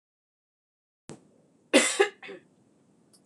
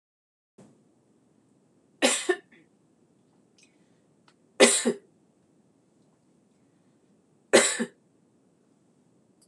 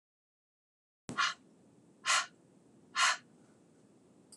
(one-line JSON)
{"cough_length": "3.3 s", "cough_amplitude": 15599, "cough_signal_mean_std_ratio": 0.25, "three_cough_length": "9.5 s", "three_cough_amplitude": 25657, "three_cough_signal_mean_std_ratio": 0.22, "exhalation_length": "4.4 s", "exhalation_amplitude": 5398, "exhalation_signal_mean_std_ratio": 0.31, "survey_phase": "beta (2021-08-13 to 2022-03-07)", "age": "45-64", "gender": "Female", "wearing_mask": "No", "symptom_cough_any": true, "symptom_runny_or_blocked_nose": true, "symptom_shortness_of_breath": true, "symptom_fatigue": true, "symptom_headache": true, "symptom_onset": "4 days", "smoker_status": "Never smoked", "respiratory_condition_asthma": false, "respiratory_condition_other": false, "recruitment_source": "Test and Trace", "submission_delay": "1 day", "covid_test_result": "Positive", "covid_test_method": "RT-qPCR", "covid_ct_value": 29.5, "covid_ct_gene": "N gene"}